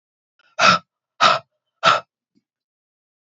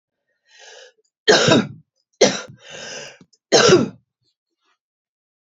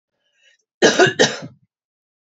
{
  "exhalation_length": "3.2 s",
  "exhalation_amplitude": 28036,
  "exhalation_signal_mean_std_ratio": 0.31,
  "three_cough_length": "5.5 s",
  "three_cough_amplitude": 30401,
  "three_cough_signal_mean_std_ratio": 0.34,
  "cough_length": "2.2 s",
  "cough_amplitude": 28822,
  "cough_signal_mean_std_ratio": 0.34,
  "survey_phase": "beta (2021-08-13 to 2022-03-07)",
  "age": "45-64",
  "gender": "Female",
  "wearing_mask": "No",
  "symptom_cough_any": true,
  "symptom_shortness_of_breath": true,
  "symptom_sore_throat": true,
  "symptom_fatigue": true,
  "symptom_fever_high_temperature": true,
  "symptom_headache": true,
  "symptom_other": true,
  "smoker_status": "Current smoker (1 to 10 cigarettes per day)",
  "respiratory_condition_asthma": false,
  "respiratory_condition_other": false,
  "recruitment_source": "Test and Trace",
  "submission_delay": "1 day",
  "covid_test_result": "Positive",
  "covid_test_method": "RT-qPCR",
  "covid_ct_value": 21.1,
  "covid_ct_gene": "ORF1ab gene",
  "covid_ct_mean": 21.7,
  "covid_viral_load": "74000 copies/ml",
  "covid_viral_load_category": "Low viral load (10K-1M copies/ml)"
}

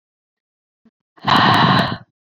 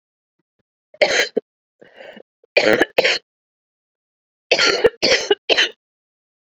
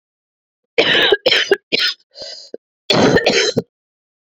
{
  "exhalation_length": "2.4 s",
  "exhalation_amplitude": 25832,
  "exhalation_signal_mean_std_ratio": 0.45,
  "three_cough_length": "6.6 s",
  "three_cough_amplitude": 31837,
  "three_cough_signal_mean_std_ratio": 0.37,
  "cough_length": "4.3 s",
  "cough_amplitude": 30820,
  "cough_signal_mean_std_ratio": 0.51,
  "survey_phase": "beta (2021-08-13 to 2022-03-07)",
  "age": "18-44",
  "gender": "Female",
  "wearing_mask": "Yes",
  "symptom_cough_any": true,
  "symptom_runny_or_blocked_nose": true,
  "symptom_shortness_of_breath": true,
  "symptom_sore_throat": true,
  "symptom_fatigue": true,
  "symptom_fever_high_temperature": true,
  "symptom_headache": true,
  "symptom_change_to_sense_of_smell_or_taste": true,
  "symptom_onset": "7 days",
  "smoker_status": "Ex-smoker",
  "respiratory_condition_asthma": false,
  "respiratory_condition_other": false,
  "recruitment_source": "Test and Trace",
  "submission_delay": "1 day",
  "covid_test_result": "Positive",
  "covid_test_method": "RT-qPCR"
}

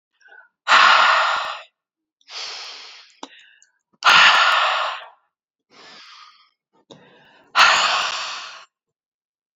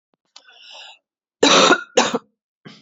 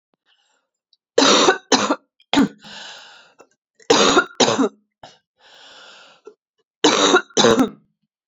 {
  "exhalation_length": "9.6 s",
  "exhalation_amplitude": 29704,
  "exhalation_signal_mean_std_ratio": 0.42,
  "cough_length": "2.8 s",
  "cough_amplitude": 31591,
  "cough_signal_mean_std_ratio": 0.36,
  "three_cough_length": "8.3 s",
  "three_cough_amplitude": 31016,
  "three_cough_signal_mean_std_ratio": 0.42,
  "survey_phase": "beta (2021-08-13 to 2022-03-07)",
  "age": "45-64",
  "gender": "Female",
  "wearing_mask": "No",
  "symptom_cough_any": true,
  "symptom_runny_or_blocked_nose": true,
  "symptom_sore_throat": true,
  "symptom_fatigue": true,
  "symptom_fever_high_temperature": true,
  "symptom_headache": true,
  "symptom_onset": "10 days",
  "smoker_status": "Ex-smoker",
  "respiratory_condition_asthma": false,
  "respiratory_condition_other": false,
  "recruitment_source": "Test and Trace",
  "submission_delay": "1 day",
  "covid_test_result": "Positive",
  "covid_test_method": "ePCR"
}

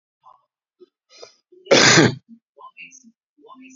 {
  "cough_length": "3.8 s",
  "cough_amplitude": 30302,
  "cough_signal_mean_std_ratio": 0.29,
  "survey_phase": "beta (2021-08-13 to 2022-03-07)",
  "age": "45-64",
  "gender": "Male",
  "wearing_mask": "No",
  "symptom_none": true,
  "smoker_status": "Current smoker (e-cigarettes or vapes only)",
  "respiratory_condition_asthma": true,
  "respiratory_condition_other": true,
  "recruitment_source": "REACT",
  "submission_delay": "1 day",
  "covid_test_result": "Negative",
  "covid_test_method": "RT-qPCR"
}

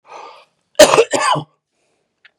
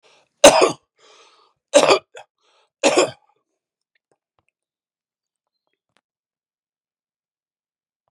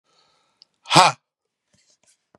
{
  "cough_length": "2.4 s",
  "cough_amplitude": 32768,
  "cough_signal_mean_std_ratio": 0.35,
  "three_cough_length": "8.1 s",
  "three_cough_amplitude": 32768,
  "three_cough_signal_mean_std_ratio": 0.22,
  "exhalation_length": "2.4 s",
  "exhalation_amplitude": 32768,
  "exhalation_signal_mean_std_ratio": 0.21,
  "survey_phase": "beta (2021-08-13 to 2022-03-07)",
  "age": "45-64",
  "gender": "Male",
  "wearing_mask": "No",
  "symptom_change_to_sense_of_smell_or_taste": true,
  "symptom_onset": "3 days",
  "smoker_status": "Ex-smoker",
  "respiratory_condition_asthma": false,
  "respiratory_condition_other": false,
  "recruitment_source": "Test and Trace",
  "submission_delay": "1 day",
  "covid_test_result": "Positive",
  "covid_test_method": "RT-qPCR",
  "covid_ct_value": 18.2,
  "covid_ct_gene": "ORF1ab gene",
  "covid_ct_mean": 18.4,
  "covid_viral_load": "900000 copies/ml",
  "covid_viral_load_category": "Low viral load (10K-1M copies/ml)"
}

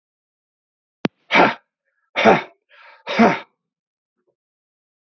{
  "exhalation_length": "5.1 s",
  "exhalation_amplitude": 32529,
  "exhalation_signal_mean_std_ratio": 0.29,
  "survey_phase": "beta (2021-08-13 to 2022-03-07)",
  "age": "45-64",
  "gender": "Male",
  "wearing_mask": "No",
  "symptom_runny_or_blocked_nose": true,
  "symptom_fatigue": true,
  "symptom_headache": true,
  "smoker_status": "Ex-smoker",
  "respiratory_condition_asthma": false,
  "respiratory_condition_other": false,
  "recruitment_source": "Test and Trace",
  "submission_delay": "1 day",
  "covid_test_result": "Positive",
  "covid_test_method": "RT-qPCR",
  "covid_ct_value": 19.6,
  "covid_ct_gene": "ORF1ab gene"
}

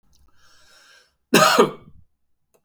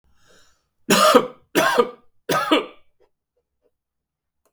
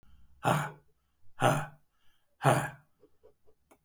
{
  "cough_length": "2.6 s",
  "cough_amplitude": 32467,
  "cough_signal_mean_std_ratio": 0.31,
  "three_cough_length": "4.5 s",
  "three_cough_amplitude": 32768,
  "three_cough_signal_mean_std_ratio": 0.37,
  "exhalation_length": "3.8 s",
  "exhalation_amplitude": 14382,
  "exhalation_signal_mean_std_ratio": 0.35,
  "survey_phase": "beta (2021-08-13 to 2022-03-07)",
  "age": "65+",
  "gender": "Male",
  "wearing_mask": "No",
  "symptom_none": true,
  "smoker_status": "Never smoked",
  "respiratory_condition_asthma": false,
  "respiratory_condition_other": false,
  "recruitment_source": "REACT",
  "submission_delay": "2 days",
  "covid_test_result": "Negative",
  "covid_test_method": "RT-qPCR",
  "influenza_a_test_result": "Negative",
  "influenza_b_test_result": "Negative"
}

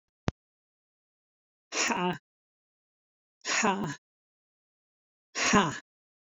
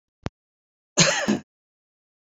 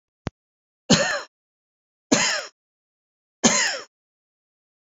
{
  "exhalation_length": "6.4 s",
  "exhalation_amplitude": 14367,
  "exhalation_signal_mean_std_ratio": 0.33,
  "cough_length": "2.3 s",
  "cough_amplitude": 24318,
  "cough_signal_mean_std_ratio": 0.31,
  "three_cough_length": "4.9 s",
  "three_cough_amplitude": 26739,
  "three_cough_signal_mean_std_ratio": 0.33,
  "survey_phase": "beta (2021-08-13 to 2022-03-07)",
  "age": "65+",
  "gender": "Female",
  "wearing_mask": "No",
  "symptom_none": true,
  "smoker_status": "Never smoked",
  "respiratory_condition_asthma": false,
  "respiratory_condition_other": false,
  "recruitment_source": "REACT",
  "submission_delay": "2 days",
  "covid_test_result": "Negative",
  "covid_test_method": "RT-qPCR"
}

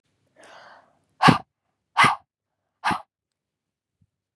{
  "exhalation_length": "4.4 s",
  "exhalation_amplitude": 30507,
  "exhalation_signal_mean_std_ratio": 0.24,
  "survey_phase": "beta (2021-08-13 to 2022-03-07)",
  "age": "18-44",
  "gender": "Female",
  "wearing_mask": "No",
  "symptom_fatigue": true,
  "smoker_status": "Never smoked",
  "respiratory_condition_asthma": false,
  "respiratory_condition_other": false,
  "recruitment_source": "REACT",
  "submission_delay": "2 days",
  "covid_test_result": "Negative",
  "covid_test_method": "RT-qPCR",
  "influenza_a_test_result": "Negative",
  "influenza_b_test_result": "Negative"
}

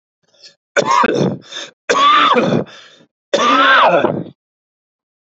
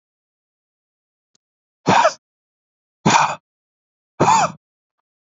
{
  "three_cough_length": "5.3 s",
  "three_cough_amplitude": 30943,
  "three_cough_signal_mean_std_ratio": 0.58,
  "exhalation_length": "5.4 s",
  "exhalation_amplitude": 31259,
  "exhalation_signal_mean_std_ratio": 0.31,
  "survey_phase": "beta (2021-08-13 to 2022-03-07)",
  "age": "18-44",
  "gender": "Male",
  "wearing_mask": "No",
  "symptom_fatigue": true,
  "smoker_status": "Never smoked",
  "respiratory_condition_asthma": false,
  "respiratory_condition_other": false,
  "recruitment_source": "REACT",
  "submission_delay": "2 days",
  "covid_test_result": "Negative",
  "covid_test_method": "RT-qPCR",
  "influenza_a_test_result": "Negative",
  "influenza_b_test_result": "Negative"
}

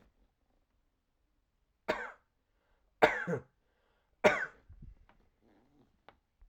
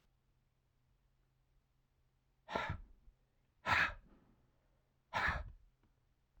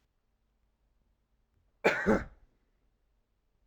{
  "three_cough_length": "6.5 s",
  "three_cough_amplitude": 16277,
  "three_cough_signal_mean_std_ratio": 0.22,
  "exhalation_length": "6.4 s",
  "exhalation_amplitude": 3280,
  "exhalation_signal_mean_std_ratio": 0.3,
  "cough_length": "3.7 s",
  "cough_amplitude": 8452,
  "cough_signal_mean_std_ratio": 0.24,
  "survey_phase": "alpha (2021-03-01 to 2021-08-12)",
  "age": "18-44",
  "gender": "Male",
  "wearing_mask": "No",
  "symptom_diarrhoea": true,
  "symptom_fatigue": true,
  "symptom_fever_high_temperature": true,
  "symptom_headache": true,
  "symptom_change_to_sense_of_smell_or_taste": true,
  "smoker_status": "Never smoked",
  "respiratory_condition_asthma": false,
  "respiratory_condition_other": false,
  "recruitment_source": "Test and Trace",
  "submission_delay": "2 days",
  "covid_test_result": "Positive",
  "covid_test_method": "RT-qPCR",
  "covid_ct_value": 20.9,
  "covid_ct_gene": "ORF1ab gene",
  "covid_ct_mean": 21.5,
  "covid_viral_load": "90000 copies/ml",
  "covid_viral_load_category": "Low viral load (10K-1M copies/ml)"
}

